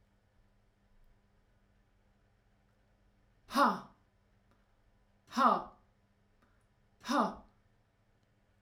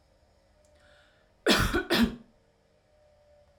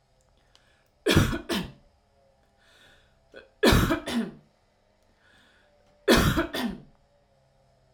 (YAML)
exhalation_length: 8.6 s
exhalation_amplitude: 6466
exhalation_signal_mean_std_ratio: 0.25
cough_length: 3.6 s
cough_amplitude: 11509
cough_signal_mean_std_ratio: 0.34
three_cough_length: 7.9 s
three_cough_amplitude: 20406
three_cough_signal_mean_std_ratio: 0.36
survey_phase: alpha (2021-03-01 to 2021-08-12)
age: 45-64
gender: Female
wearing_mask: 'No'
symptom_none: true
smoker_status: Never smoked
respiratory_condition_asthma: false
respiratory_condition_other: false
recruitment_source: REACT
submission_delay: 3 days
covid_test_result: Negative
covid_test_method: RT-qPCR